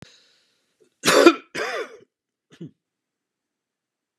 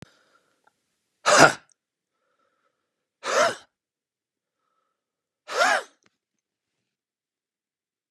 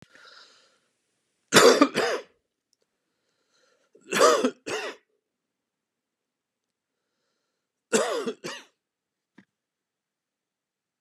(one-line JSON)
{"cough_length": "4.2 s", "cough_amplitude": 32513, "cough_signal_mean_std_ratio": 0.25, "exhalation_length": "8.1 s", "exhalation_amplitude": 32767, "exhalation_signal_mean_std_ratio": 0.23, "three_cough_length": "11.0 s", "three_cough_amplitude": 29033, "three_cough_signal_mean_std_ratio": 0.26, "survey_phase": "beta (2021-08-13 to 2022-03-07)", "age": "65+", "gender": "Male", "wearing_mask": "No", "symptom_shortness_of_breath": true, "symptom_onset": "12 days", "smoker_status": "Never smoked", "respiratory_condition_asthma": false, "respiratory_condition_other": false, "recruitment_source": "REACT", "submission_delay": "5 days", "covid_test_result": "Negative", "covid_test_method": "RT-qPCR", "influenza_a_test_result": "Negative", "influenza_b_test_result": "Negative"}